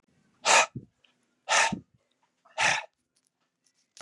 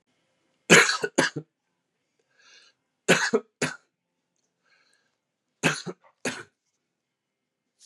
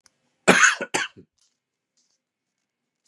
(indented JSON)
{
  "exhalation_length": "4.0 s",
  "exhalation_amplitude": 18921,
  "exhalation_signal_mean_std_ratio": 0.33,
  "three_cough_length": "7.9 s",
  "three_cough_amplitude": 28730,
  "three_cough_signal_mean_std_ratio": 0.25,
  "cough_length": "3.1 s",
  "cough_amplitude": 30994,
  "cough_signal_mean_std_ratio": 0.27,
  "survey_phase": "beta (2021-08-13 to 2022-03-07)",
  "age": "45-64",
  "gender": "Male",
  "wearing_mask": "No",
  "symptom_none": true,
  "smoker_status": "Never smoked",
  "respiratory_condition_asthma": false,
  "respiratory_condition_other": false,
  "recruitment_source": "REACT",
  "submission_delay": "1 day",
  "covid_test_result": "Negative",
  "covid_test_method": "RT-qPCR",
  "influenza_a_test_result": "Unknown/Void",
  "influenza_b_test_result": "Unknown/Void"
}